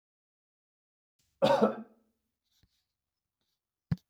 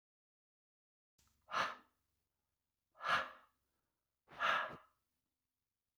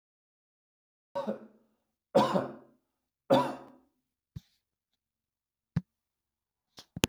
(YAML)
cough_length: 4.1 s
cough_amplitude: 8117
cough_signal_mean_std_ratio: 0.23
exhalation_length: 6.0 s
exhalation_amplitude: 2271
exhalation_signal_mean_std_ratio: 0.29
three_cough_length: 7.1 s
three_cough_amplitude: 16817
three_cough_signal_mean_std_ratio: 0.24
survey_phase: beta (2021-08-13 to 2022-03-07)
age: 45-64
gender: Male
wearing_mask: 'No'
symptom_sore_throat: true
smoker_status: Never smoked
respiratory_condition_asthma: false
respiratory_condition_other: false
recruitment_source: REACT
submission_delay: 4 days
covid_test_result: Negative
covid_test_method: RT-qPCR